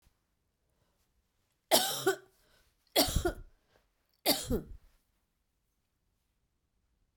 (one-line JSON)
{"three_cough_length": "7.2 s", "three_cough_amplitude": 11231, "three_cough_signal_mean_std_ratio": 0.29, "survey_phase": "beta (2021-08-13 to 2022-03-07)", "age": "45-64", "gender": "Female", "wearing_mask": "No", "symptom_new_continuous_cough": true, "symptom_runny_or_blocked_nose": true, "symptom_sore_throat": true, "symptom_fatigue": true, "symptom_headache": true, "symptom_change_to_sense_of_smell_or_taste": true, "symptom_onset": "4 days", "smoker_status": "Never smoked", "respiratory_condition_asthma": false, "respiratory_condition_other": false, "recruitment_source": "Test and Trace", "submission_delay": "2 days", "covid_test_result": "Positive", "covid_test_method": "RT-qPCR", "covid_ct_value": 23.2, "covid_ct_gene": "ORF1ab gene"}